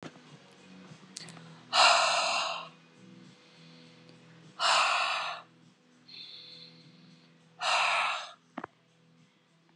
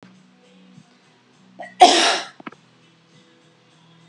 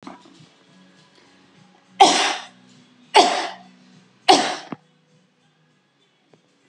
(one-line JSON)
{"exhalation_length": "9.8 s", "exhalation_amplitude": 10869, "exhalation_signal_mean_std_ratio": 0.43, "cough_length": "4.1 s", "cough_amplitude": 32768, "cough_signal_mean_std_ratio": 0.25, "three_cough_length": "6.7 s", "three_cough_amplitude": 32645, "three_cough_signal_mean_std_ratio": 0.28, "survey_phase": "beta (2021-08-13 to 2022-03-07)", "age": "45-64", "gender": "Female", "wearing_mask": "No", "symptom_none": true, "smoker_status": "Ex-smoker", "respiratory_condition_asthma": false, "respiratory_condition_other": false, "recruitment_source": "REACT", "submission_delay": "1 day", "covid_test_result": "Negative", "covid_test_method": "RT-qPCR"}